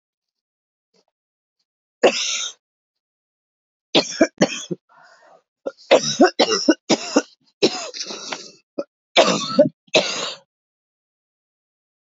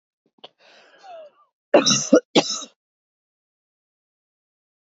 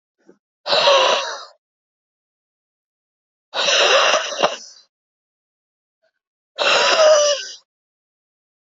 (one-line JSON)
{"three_cough_length": "12.0 s", "three_cough_amplitude": 29266, "three_cough_signal_mean_std_ratio": 0.34, "cough_length": "4.9 s", "cough_amplitude": 29949, "cough_signal_mean_std_ratio": 0.25, "exhalation_length": "8.8 s", "exhalation_amplitude": 28281, "exhalation_signal_mean_std_ratio": 0.44, "survey_phase": "beta (2021-08-13 to 2022-03-07)", "age": "18-44", "gender": "Female", "wearing_mask": "No", "symptom_cough_any": true, "symptom_runny_or_blocked_nose": true, "symptom_abdominal_pain": true, "symptom_fatigue": true, "symptom_fever_high_temperature": true, "symptom_headache": true, "symptom_onset": "2 days", "smoker_status": "Current smoker (1 to 10 cigarettes per day)", "respiratory_condition_asthma": true, "respiratory_condition_other": false, "recruitment_source": "Test and Trace", "submission_delay": "1 day", "covid_test_result": "Positive", "covid_test_method": "ePCR"}